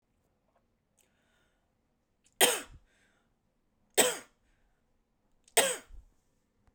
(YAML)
three_cough_length: 6.7 s
three_cough_amplitude: 13788
three_cough_signal_mean_std_ratio: 0.22
survey_phase: beta (2021-08-13 to 2022-03-07)
age: 45-64
gender: Female
wearing_mask: 'Yes'
symptom_none: true
smoker_status: Current smoker (1 to 10 cigarettes per day)
respiratory_condition_asthma: false
respiratory_condition_other: false
recruitment_source: REACT
submission_delay: 3 days
covid_test_result: Negative
covid_test_method: RT-qPCR